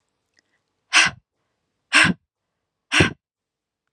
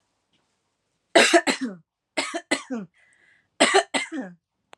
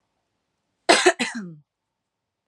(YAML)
exhalation_length: 3.9 s
exhalation_amplitude: 30437
exhalation_signal_mean_std_ratio: 0.29
three_cough_length: 4.8 s
three_cough_amplitude: 27939
three_cough_signal_mean_std_ratio: 0.36
cough_length: 2.5 s
cough_amplitude: 28589
cough_signal_mean_std_ratio: 0.28
survey_phase: beta (2021-08-13 to 2022-03-07)
age: 18-44
gender: Female
wearing_mask: 'No'
symptom_sore_throat: true
symptom_headache: true
smoker_status: Never smoked
respiratory_condition_asthma: false
respiratory_condition_other: false
recruitment_source: REACT
submission_delay: 2 days
covid_test_result: Negative
covid_test_method: RT-qPCR